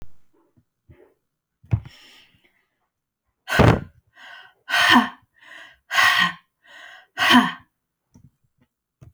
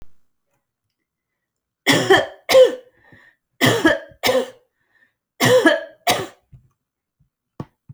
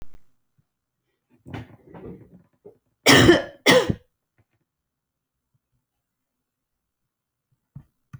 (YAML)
exhalation_length: 9.1 s
exhalation_amplitude: 28881
exhalation_signal_mean_std_ratio: 0.33
three_cough_length: 7.9 s
three_cough_amplitude: 29334
three_cough_signal_mean_std_ratio: 0.37
cough_length: 8.2 s
cough_amplitude: 32768
cough_signal_mean_std_ratio: 0.23
survey_phase: beta (2021-08-13 to 2022-03-07)
age: 45-64
gender: Female
wearing_mask: 'No'
symptom_none: true
smoker_status: Never smoked
respiratory_condition_asthma: false
respiratory_condition_other: false
recruitment_source: REACT
submission_delay: 1 day
covid_test_result: Negative
covid_test_method: RT-qPCR